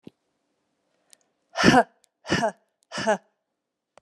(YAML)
exhalation_length: 4.0 s
exhalation_amplitude: 26861
exhalation_signal_mean_std_ratio: 0.29
survey_phase: beta (2021-08-13 to 2022-03-07)
age: 45-64
gender: Female
wearing_mask: 'No'
symptom_cough_any: true
symptom_runny_or_blocked_nose: true
symptom_sore_throat: true
symptom_fatigue: true
symptom_change_to_sense_of_smell_or_taste: true
symptom_loss_of_taste: true
symptom_onset: 4 days
smoker_status: Never smoked
respiratory_condition_asthma: false
respiratory_condition_other: false
recruitment_source: Test and Trace
submission_delay: 2 days
covid_test_result: Positive
covid_test_method: RT-qPCR
covid_ct_value: 18.3
covid_ct_gene: ORF1ab gene
covid_ct_mean: 18.8
covid_viral_load: 690000 copies/ml
covid_viral_load_category: Low viral load (10K-1M copies/ml)